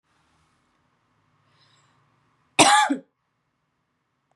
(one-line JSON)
{"cough_length": "4.4 s", "cough_amplitude": 29641, "cough_signal_mean_std_ratio": 0.23, "survey_phase": "beta (2021-08-13 to 2022-03-07)", "age": "18-44", "gender": "Female", "wearing_mask": "No", "symptom_runny_or_blocked_nose": true, "symptom_sore_throat": true, "symptom_abdominal_pain": true, "symptom_fatigue": true, "symptom_headache": true, "symptom_onset": "4 days", "smoker_status": "Never smoked", "respiratory_condition_asthma": true, "respiratory_condition_other": false, "recruitment_source": "REACT", "submission_delay": "2 days", "covid_test_result": "Negative", "covid_test_method": "RT-qPCR", "influenza_a_test_result": "Unknown/Void", "influenza_b_test_result": "Unknown/Void"}